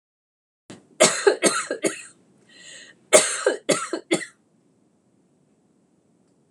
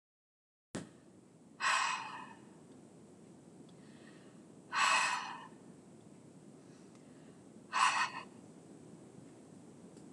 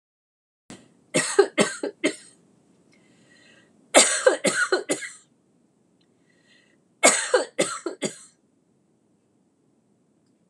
{"cough_length": "6.5 s", "cough_amplitude": 26028, "cough_signal_mean_std_ratio": 0.33, "exhalation_length": "10.1 s", "exhalation_amplitude": 4223, "exhalation_signal_mean_std_ratio": 0.42, "three_cough_length": "10.5 s", "three_cough_amplitude": 26028, "three_cough_signal_mean_std_ratio": 0.32, "survey_phase": "beta (2021-08-13 to 2022-03-07)", "age": "65+", "gender": "Female", "wearing_mask": "No", "symptom_none": true, "smoker_status": "Never smoked", "respiratory_condition_asthma": true, "respiratory_condition_other": false, "recruitment_source": "REACT", "submission_delay": "1 day", "covid_test_result": "Negative", "covid_test_method": "RT-qPCR"}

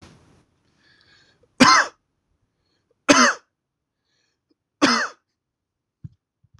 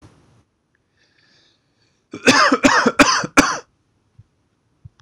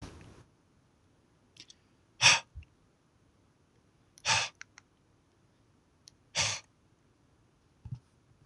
{"three_cough_length": "6.6 s", "three_cough_amplitude": 26027, "three_cough_signal_mean_std_ratio": 0.26, "cough_length": "5.0 s", "cough_amplitude": 26028, "cough_signal_mean_std_ratio": 0.35, "exhalation_length": "8.5 s", "exhalation_amplitude": 18190, "exhalation_signal_mean_std_ratio": 0.23, "survey_phase": "beta (2021-08-13 to 2022-03-07)", "age": "18-44", "gender": "Male", "wearing_mask": "No", "symptom_none": true, "smoker_status": "Never smoked", "respiratory_condition_asthma": false, "respiratory_condition_other": false, "recruitment_source": "REACT", "submission_delay": "1 day", "covid_test_result": "Negative", "covid_test_method": "RT-qPCR", "influenza_a_test_result": "Negative", "influenza_b_test_result": "Negative"}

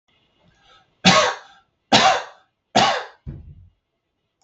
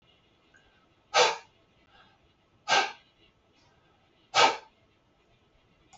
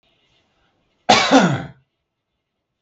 {"three_cough_length": "4.4 s", "three_cough_amplitude": 32768, "three_cough_signal_mean_std_ratio": 0.36, "exhalation_length": "6.0 s", "exhalation_amplitude": 14829, "exhalation_signal_mean_std_ratio": 0.26, "cough_length": "2.8 s", "cough_amplitude": 32768, "cough_signal_mean_std_ratio": 0.33, "survey_phase": "beta (2021-08-13 to 2022-03-07)", "age": "45-64", "gender": "Male", "wearing_mask": "No", "symptom_abdominal_pain": true, "smoker_status": "Never smoked", "respiratory_condition_asthma": false, "respiratory_condition_other": false, "recruitment_source": "REACT", "submission_delay": "6 days", "covid_test_result": "Negative", "covid_test_method": "RT-qPCR", "influenza_a_test_result": "Negative", "influenza_b_test_result": "Negative"}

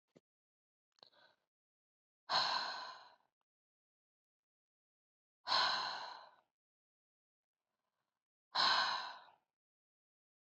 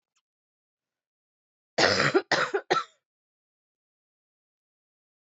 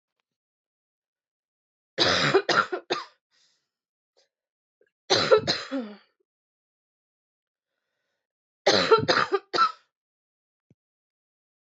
{"exhalation_length": "10.6 s", "exhalation_amplitude": 3007, "exhalation_signal_mean_std_ratio": 0.31, "cough_length": "5.2 s", "cough_amplitude": 14517, "cough_signal_mean_std_ratio": 0.29, "three_cough_length": "11.7 s", "three_cough_amplitude": 18792, "three_cough_signal_mean_std_ratio": 0.32, "survey_phase": "beta (2021-08-13 to 2022-03-07)", "age": "45-64", "gender": "Female", "wearing_mask": "No", "symptom_cough_any": true, "symptom_sore_throat": true, "symptom_headache": true, "symptom_onset": "7 days", "smoker_status": "Never smoked", "respiratory_condition_asthma": false, "respiratory_condition_other": false, "recruitment_source": "Test and Trace", "submission_delay": "1 day", "covid_test_result": "Positive", "covid_test_method": "RT-qPCR", "covid_ct_value": 19.8, "covid_ct_gene": "N gene"}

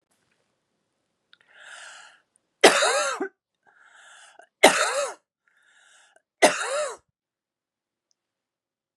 {"three_cough_length": "9.0 s", "three_cough_amplitude": 32758, "three_cough_signal_mean_std_ratio": 0.28, "survey_phase": "beta (2021-08-13 to 2022-03-07)", "age": "45-64", "gender": "Female", "wearing_mask": "No", "symptom_cough_any": true, "symptom_runny_or_blocked_nose": true, "symptom_fatigue": true, "symptom_headache": true, "symptom_onset": "4 days", "smoker_status": "Current smoker (e-cigarettes or vapes only)", "respiratory_condition_asthma": false, "respiratory_condition_other": false, "recruitment_source": "Test and Trace", "submission_delay": "1 day", "covid_test_result": "Positive", "covid_test_method": "RT-qPCR", "covid_ct_value": 27.7, "covid_ct_gene": "ORF1ab gene"}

